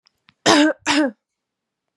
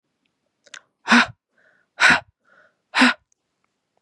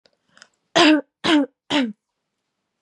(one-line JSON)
{"cough_length": "2.0 s", "cough_amplitude": 31973, "cough_signal_mean_std_ratio": 0.42, "exhalation_length": "4.0 s", "exhalation_amplitude": 29585, "exhalation_signal_mean_std_ratio": 0.29, "three_cough_length": "2.8 s", "three_cough_amplitude": 27419, "three_cough_signal_mean_std_ratio": 0.4, "survey_phase": "beta (2021-08-13 to 2022-03-07)", "age": "18-44", "gender": "Female", "wearing_mask": "No", "symptom_runny_or_blocked_nose": true, "symptom_sore_throat": true, "symptom_onset": "6 days", "smoker_status": "Never smoked", "recruitment_source": "REACT", "submission_delay": "-1 day", "covid_test_result": "Positive", "covid_test_method": "RT-qPCR", "covid_ct_value": 19.5, "covid_ct_gene": "E gene", "influenza_a_test_result": "Negative", "influenza_b_test_result": "Negative"}